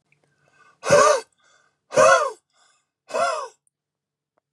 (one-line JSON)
{"exhalation_length": "4.5 s", "exhalation_amplitude": 24464, "exhalation_signal_mean_std_ratio": 0.36, "survey_phase": "beta (2021-08-13 to 2022-03-07)", "age": "45-64", "gender": "Male", "wearing_mask": "No", "symptom_diarrhoea": true, "symptom_headache": true, "symptom_change_to_sense_of_smell_or_taste": true, "smoker_status": "Never smoked", "respiratory_condition_asthma": true, "respiratory_condition_other": false, "recruitment_source": "Test and Trace", "submission_delay": "2 days", "covid_test_result": "Positive", "covid_test_method": "RT-qPCR", "covid_ct_value": 27.4, "covid_ct_gene": "ORF1ab gene", "covid_ct_mean": 28.4, "covid_viral_load": "470 copies/ml", "covid_viral_load_category": "Minimal viral load (< 10K copies/ml)"}